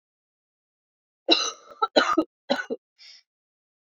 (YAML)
cough_length: 3.8 s
cough_amplitude: 21782
cough_signal_mean_std_ratio: 0.31
survey_phase: beta (2021-08-13 to 2022-03-07)
age: 45-64
gender: Female
wearing_mask: 'No'
symptom_cough_any: true
symptom_new_continuous_cough: true
symptom_runny_or_blocked_nose: true
symptom_sore_throat: true
symptom_fatigue: true
symptom_onset: 3 days
smoker_status: Never smoked
respiratory_condition_asthma: false
respiratory_condition_other: false
recruitment_source: Test and Trace
submission_delay: 1 day
covid_test_result: Positive
covid_test_method: RT-qPCR
covid_ct_value: 18.6
covid_ct_gene: ORF1ab gene
covid_ct_mean: 19.1
covid_viral_load: 550000 copies/ml
covid_viral_load_category: Low viral load (10K-1M copies/ml)